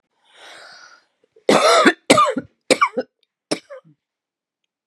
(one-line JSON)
{"cough_length": "4.9 s", "cough_amplitude": 32768, "cough_signal_mean_std_ratio": 0.36, "survey_phase": "beta (2021-08-13 to 2022-03-07)", "age": "45-64", "gender": "Female", "wearing_mask": "No", "symptom_cough_any": true, "symptom_new_continuous_cough": true, "symptom_runny_or_blocked_nose": true, "symptom_shortness_of_breath": true, "symptom_sore_throat": true, "symptom_abdominal_pain": true, "symptom_fatigue": true, "symptom_fever_high_temperature": true, "symptom_headache": true, "symptom_change_to_sense_of_smell_or_taste": true, "symptom_other": true, "smoker_status": "Ex-smoker", "respiratory_condition_asthma": false, "respiratory_condition_other": false, "recruitment_source": "Test and Trace", "submission_delay": "1 day", "covid_test_result": "Positive", "covid_test_method": "RT-qPCR", "covid_ct_value": 27.9, "covid_ct_gene": "N gene"}